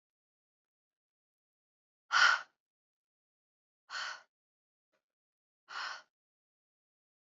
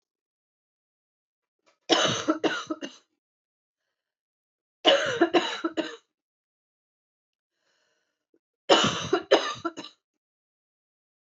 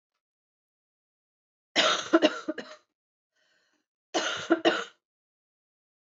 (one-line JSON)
{"exhalation_length": "7.3 s", "exhalation_amplitude": 7033, "exhalation_signal_mean_std_ratio": 0.2, "three_cough_length": "11.3 s", "three_cough_amplitude": 18871, "three_cough_signal_mean_std_ratio": 0.32, "cough_length": "6.1 s", "cough_amplitude": 15416, "cough_signal_mean_std_ratio": 0.3, "survey_phase": "beta (2021-08-13 to 2022-03-07)", "age": "18-44", "gender": "Female", "wearing_mask": "No", "symptom_none": true, "smoker_status": "Never smoked", "respiratory_condition_asthma": false, "respiratory_condition_other": false, "recruitment_source": "REACT", "submission_delay": "2 days", "covid_test_result": "Negative", "covid_test_method": "RT-qPCR", "influenza_a_test_result": "Negative", "influenza_b_test_result": "Negative"}